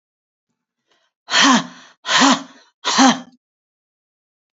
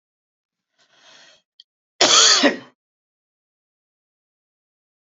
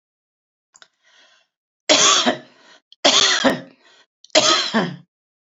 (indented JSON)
{
  "exhalation_length": "4.5 s",
  "exhalation_amplitude": 32156,
  "exhalation_signal_mean_std_ratio": 0.37,
  "cough_length": "5.1 s",
  "cough_amplitude": 30872,
  "cough_signal_mean_std_ratio": 0.26,
  "three_cough_length": "5.5 s",
  "three_cough_amplitude": 31478,
  "three_cough_signal_mean_std_ratio": 0.42,
  "survey_phase": "beta (2021-08-13 to 2022-03-07)",
  "age": "65+",
  "gender": "Female",
  "wearing_mask": "No",
  "symptom_cough_any": true,
  "smoker_status": "Ex-smoker",
  "respiratory_condition_asthma": false,
  "respiratory_condition_other": false,
  "recruitment_source": "REACT",
  "submission_delay": "1 day",
  "covid_test_result": "Negative",
  "covid_test_method": "RT-qPCR",
  "influenza_a_test_result": "Negative",
  "influenza_b_test_result": "Negative"
}